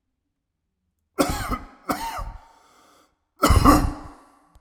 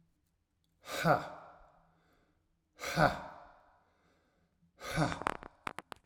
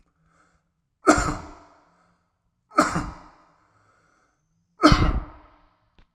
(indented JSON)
{
  "cough_length": "4.6 s",
  "cough_amplitude": 31555,
  "cough_signal_mean_std_ratio": 0.37,
  "exhalation_length": "6.1 s",
  "exhalation_amplitude": 9339,
  "exhalation_signal_mean_std_ratio": 0.32,
  "three_cough_length": "6.1 s",
  "three_cough_amplitude": 30074,
  "three_cough_signal_mean_std_ratio": 0.29,
  "survey_phase": "alpha (2021-03-01 to 2021-08-12)",
  "age": "45-64",
  "gender": "Male",
  "wearing_mask": "No",
  "symptom_none": true,
  "smoker_status": "Ex-smoker",
  "respiratory_condition_asthma": false,
  "respiratory_condition_other": false,
  "recruitment_source": "REACT",
  "submission_delay": "3 days",
  "covid_test_result": "Negative",
  "covid_test_method": "RT-qPCR"
}